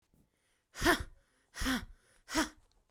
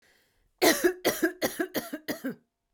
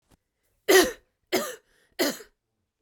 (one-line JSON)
{"exhalation_length": "2.9 s", "exhalation_amplitude": 7409, "exhalation_signal_mean_std_ratio": 0.37, "cough_length": "2.7 s", "cough_amplitude": 14273, "cough_signal_mean_std_ratio": 0.46, "three_cough_length": "2.8 s", "three_cough_amplitude": 20666, "three_cough_signal_mean_std_ratio": 0.32, "survey_phase": "beta (2021-08-13 to 2022-03-07)", "age": "18-44", "gender": "Female", "wearing_mask": "No", "symptom_headache": true, "smoker_status": "Never smoked", "respiratory_condition_asthma": false, "respiratory_condition_other": false, "recruitment_source": "REACT", "submission_delay": "2 days", "covid_test_result": "Negative", "covid_test_method": "RT-qPCR"}